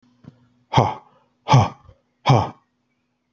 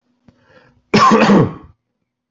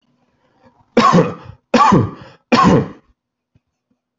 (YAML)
exhalation_length: 3.3 s
exhalation_amplitude: 32767
exhalation_signal_mean_std_ratio: 0.33
cough_length: 2.3 s
cough_amplitude: 26833
cough_signal_mean_std_ratio: 0.44
three_cough_length: 4.2 s
three_cough_amplitude: 30624
three_cough_signal_mean_std_ratio: 0.43
survey_phase: alpha (2021-03-01 to 2021-08-12)
age: 45-64
gender: Male
wearing_mask: 'No'
symptom_none: true
smoker_status: Ex-smoker
respiratory_condition_asthma: false
respiratory_condition_other: false
recruitment_source: REACT
submission_delay: 1 day
covid_test_result: Negative
covid_test_method: RT-qPCR